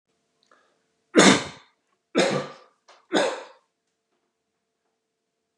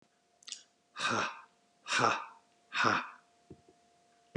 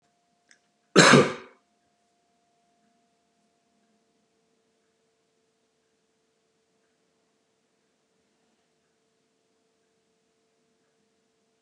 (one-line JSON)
{"three_cough_length": "5.6 s", "three_cough_amplitude": 28558, "three_cough_signal_mean_std_ratio": 0.28, "exhalation_length": "4.4 s", "exhalation_amplitude": 6695, "exhalation_signal_mean_std_ratio": 0.41, "cough_length": "11.6 s", "cough_amplitude": 29185, "cough_signal_mean_std_ratio": 0.14, "survey_phase": "beta (2021-08-13 to 2022-03-07)", "age": "45-64", "gender": "Male", "wearing_mask": "No", "symptom_none": true, "smoker_status": "Never smoked", "respiratory_condition_asthma": false, "respiratory_condition_other": false, "recruitment_source": "REACT", "submission_delay": "2 days", "covid_test_result": "Negative", "covid_test_method": "RT-qPCR", "influenza_a_test_result": "Negative", "influenza_b_test_result": "Negative"}